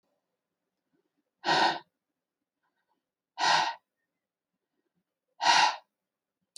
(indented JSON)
{
  "exhalation_length": "6.6 s",
  "exhalation_amplitude": 13066,
  "exhalation_signal_mean_std_ratio": 0.3,
  "survey_phase": "alpha (2021-03-01 to 2021-08-12)",
  "age": "45-64",
  "gender": "Male",
  "wearing_mask": "No",
  "symptom_none": true,
  "smoker_status": "Never smoked",
  "respiratory_condition_asthma": false,
  "respiratory_condition_other": false,
  "recruitment_source": "REACT",
  "submission_delay": "1 day",
  "covid_test_result": "Negative",
  "covid_test_method": "RT-qPCR"
}